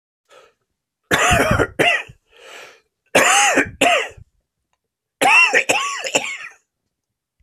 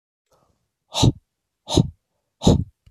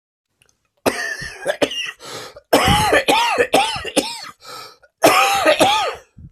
{"three_cough_length": "7.4 s", "three_cough_amplitude": 30233, "three_cough_signal_mean_std_ratio": 0.49, "exhalation_length": "2.9 s", "exhalation_amplitude": 24702, "exhalation_signal_mean_std_ratio": 0.31, "cough_length": "6.3 s", "cough_amplitude": 32458, "cough_signal_mean_std_ratio": 0.59, "survey_phase": "beta (2021-08-13 to 2022-03-07)", "age": "45-64", "gender": "Male", "wearing_mask": "No", "symptom_cough_any": true, "symptom_new_continuous_cough": true, "symptom_runny_or_blocked_nose": true, "symptom_shortness_of_breath": true, "symptom_fatigue": true, "symptom_headache": true, "symptom_change_to_sense_of_smell_or_taste": true, "symptom_onset": "3 days", "smoker_status": "Ex-smoker", "respiratory_condition_asthma": true, "respiratory_condition_other": false, "recruitment_source": "Test and Trace", "submission_delay": "1 day", "covid_test_result": "Positive", "covid_test_method": "RT-qPCR", "covid_ct_value": 24.0, "covid_ct_gene": "ORF1ab gene"}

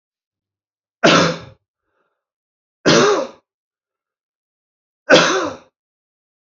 {"three_cough_length": "6.5 s", "three_cough_amplitude": 31210, "three_cough_signal_mean_std_ratio": 0.33, "survey_phase": "beta (2021-08-13 to 2022-03-07)", "age": "45-64", "gender": "Male", "wearing_mask": "No", "symptom_cough_any": true, "symptom_new_continuous_cough": true, "symptom_runny_or_blocked_nose": true, "symptom_sore_throat": true, "symptom_fatigue": true, "symptom_headache": true, "symptom_onset": "4 days", "smoker_status": "Ex-smoker", "respiratory_condition_asthma": false, "respiratory_condition_other": false, "recruitment_source": "Test and Trace", "submission_delay": "2 days", "covid_test_result": "Positive", "covid_test_method": "RT-qPCR", "covid_ct_value": 25.1, "covid_ct_gene": "N gene"}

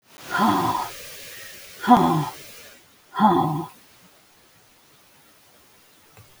{"exhalation_length": "6.4 s", "exhalation_amplitude": 27331, "exhalation_signal_mean_std_ratio": 0.42, "survey_phase": "alpha (2021-03-01 to 2021-08-12)", "age": "65+", "gender": "Female", "wearing_mask": "No", "symptom_cough_any": true, "symptom_fatigue": true, "smoker_status": "Ex-smoker", "respiratory_condition_asthma": false, "respiratory_condition_other": false, "recruitment_source": "REACT", "submission_delay": "2 days", "covid_test_result": "Negative", "covid_test_method": "RT-qPCR"}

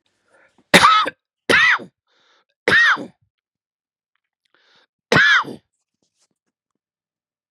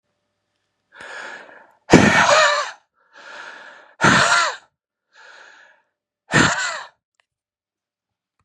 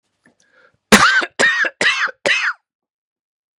{"three_cough_length": "7.5 s", "three_cough_amplitude": 32768, "three_cough_signal_mean_std_ratio": 0.35, "exhalation_length": "8.4 s", "exhalation_amplitude": 32768, "exhalation_signal_mean_std_ratio": 0.37, "cough_length": "3.6 s", "cough_amplitude": 32768, "cough_signal_mean_std_ratio": 0.46, "survey_phase": "beta (2021-08-13 to 2022-03-07)", "age": "45-64", "gender": "Male", "wearing_mask": "No", "symptom_cough_any": true, "symptom_runny_or_blocked_nose": true, "symptom_shortness_of_breath": true, "symptom_sore_throat": true, "symptom_headache": true, "smoker_status": "Ex-smoker", "respiratory_condition_asthma": false, "respiratory_condition_other": false, "recruitment_source": "Test and Trace", "submission_delay": "2 days", "covid_test_result": "Positive", "covid_test_method": "LFT"}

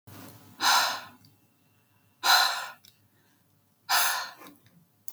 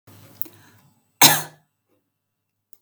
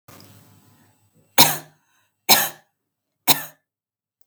{"exhalation_length": "5.1 s", "exhalation_amplitude": 13630, "exhalation_signal_mean_std_ratio": 0.4, "cough_length": "2.8 s", "cough_amplitude": 32768, "cough_signal_mean_std_ratio": 0.2, "three_cough_length": "4.3 s", "three_cough_amplitude": 32768, "three_cough_signal_mean_std_ratio": 0.25, "survey_phase": "beta (2021-08-13 to 2022-03-07)", "age": "45-64", "gender": "Female", "wearing_mask": "No", "symptom_none": true, "smoker_status": "Never smoked", "respiratory_condition_asthma": false, "respiratory_condition_other": false, "recruitment_source": "REACT", "submission_delay": "2 days", "covid_test_result": "Negative", "covid_test_method": "RT-qPCR", "influenza_a_test_result": "Negative", "influenza_b_test_result": "Negative"}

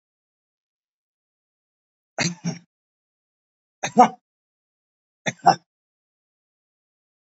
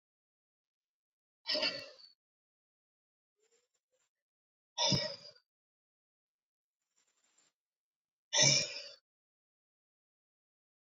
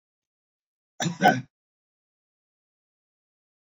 {"three_cough_length": "7.3 s", "three_cough_amplitude": 27401, "three_cough_signal_mean_std_ratio": 0.17, "exhalation_length": "10.9 s", "exhalation_amplitude": 6482, "exhalation_signal_mean_std_ratio": 0.24, "cough_length": "3.7 s", "cough_amplitude": 18467, "cough_signal_mean_std_ratio": 0.2, "survey_phase": "beta (2021-08-13 to 2022-03-07)", "age": "65+", "gender": "Male", "wearing_mask": "No", "symptom_none": true, "smoker_status": "Ex-smoker", "respiratory_condition_asthma": false, "respiratory_condition_other": false, "recruitment_source": "REACT", "submission_delay": "1 day", "covid_test_result": "Negative", "covid_test_method": "RT-qPCR"}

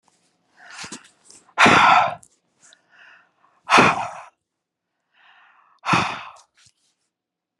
{"exhalation_length": "7.6 s", "exhalation_amplitude": 30364, "exhalation_signal_mean_std_ratio": 0.32, "survey_phase": "beta (2021-08-13 to 2022-03-07)", "age": "45-64", "gender": "Female", "wearing_mask": "No", "symptom_none": true, "smoker_status": "Ex-smoker", "respiratory_condition_asthma": false, "respiratory_condition_other": false, "recruitment_source": "REACT", "submission_delay": "2 days", "covid_test_result": "Negative", "covid_test_method": "RT-qPCR", "influenza_a_test_result": "Negative", "influenza_b_test_result": "Negative"}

